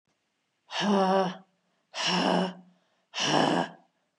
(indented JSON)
{
  "exhalation_length": "4.2 s",
  "exhalation_amplitude": 11844,
  "exhalation_signal_mean_std_ratio": 0.54,
  "survey_phase": "beta (2021-08-13 to 2022-03-07)",
  "age": "45-64",
  "gender": "Female",
  "wearing_mask": "No",
  "symptom_none": true,
  "smoker_status": "Never smoked",
  "respiratory_condition_asthma": false,
  "respiratory_condition_other": false,
  "recruitment_source": "REACT",
  "submission_delay": "1 day",
  "covid_test_result": "Negative",
  "covid_test_method": "RT-qPCR",
  "influenza_a_test_result": "Negative",
  "influenza_b_test_result": "Negative"
}